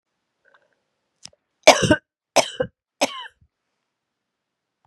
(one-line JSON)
{"three_cough_length": "4.9 s", "three_cough_amplitude": 32768, "three_cough_signal_mean_std_ratio": 0.22, "survey_phase": "beta (2021-08-13 to 2022-03-07)", "age": "18-44", "gender": "Female", "wearing_mask": "No", "symptom_new_continuous_cough": true, "symptom_sore_throat": true, "symptom_diarrhoea": true, "symptom_fatigue": true, "symptom_fever_high_temperature": true, "symptom_other": true, "smoker_status": "Never smoked", "respiratory_condition_asthma": false, "respiratory_condition_other": false, "recruitment_source": "Test and Trace", "submission_delay": "2 days", "covid_test_result": "Positive", "covid_test_method": "LFT"}